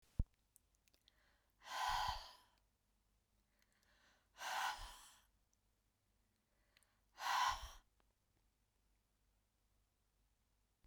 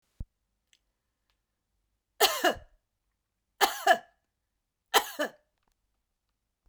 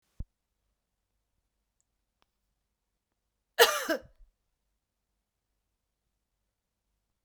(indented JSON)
{
  "exhalation_length": "10.9 s",
  "exhalation_amplitude": 2056,
  "exhalation_signal_mean_std_ratio": 0.31,
  "three_cough_length": "6.7 s",
  "three_cough_amplitude": 19616,
  "three_cough_signal_mean_std_ratio": 0.24,
  "cough_length": "7.2 s",
  "cough_amplitude": 20923,
  "cough_signal_mean_std_ratio": 0.15,
  "survey_phase": "beta (2021-08-13 to 2022-03-07)",
  "age": "45-64",
  "gender": "Female",
  "wearing_mask": "No",
  "symptom_abdominal_pain": true,
  "smoker_status": "Never smoked",
  "respiratory_condition_asthma": false,
  "respiratory_condition_other": false,
  "recruitment_source": "REACT",
  "submission_delay": "1 day",
  "covid_test_result": "Negative",
  "covid_test_method": "RT-qPCR"
}